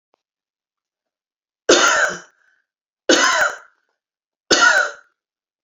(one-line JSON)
{"three_cough_length": "5.6 s", "three_cough_amplitude": 31219, "three_cough_signal_mean_std_ratio": 0.39, "survey_phase": "beta (2021-08-13 to 2022-03-07)", "age": "65+", "gender": "Female", "wearing_mask": "No", "symptom_none": true, "smoker_status": "Ex-smoker", "respiratory_condition_asthma": false, "respiratory_condition_other": false, "recruitment_source": "REACT", "submission_delay": "1 day", "covid_test_result": "Negative", "covid_test_method": "RT-qPCR"}